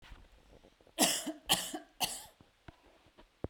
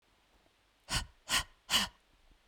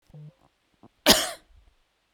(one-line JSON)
{"three_cough_length": "3.5 s", "three_cough_amplitude": 8235, "three_cough_signal_mean_std_ratio": 0.36, "exhalation_length": "2.5 s", "exhalation_amplitude": 4945, "exhalation_signal_mean_std_ratio": 0.35, "cough_length": "2.1 s", "cough_amplitude": 31679, "cough_signal_mean_std_ratio": 0.24, "survey_phase": "beta (2021-08-13 to 2022-03-07)", "age": "18-44", "gender": "Female", "wearing_mask": "No", "symptom_none": true, "smoker_status": "Never smoked", "respiratory_condition_asthma": false, "respiratory_condition_other": false, "recruitment_source": "Test and Trace", "submission_delay": "1 day", "covid_test_result": "Negative", "covid_test_method": "RT-qPCR"}